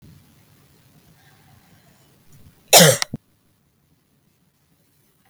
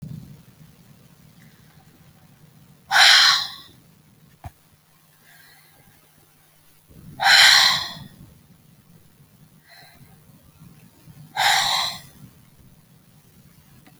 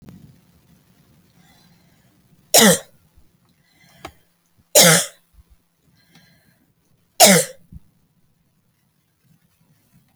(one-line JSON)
{"cough_length": "5.3 s", "cough_amplitude": 32768, "cough_signal_mean_std_ratio": 0.19, "exhalation_length": "14.0 s", "exhalation_amplitude": 30085, "exhalation_signal_mean_std_ratio": 0.31, "three_cough_length": "10.2 s", "three_cough_amplitude": 32768, "three_cough_signal_mean_std_ratio": 0.23, "survey_phase": "alpha (2021-03-01 to 2021-08-12)", "age": "45-64", "gender": "Female", "wearing_mask": "No", "symptom_none": true, "smoker_status": "Never smoked", "respiratory_condition_asthma": false, "respiratory_condition_other": false, "recruitment_source": "REACT", "submission_delay": "1 day", "covid_test_result": "Negative", "covid_test_method": "RT-qPCR"}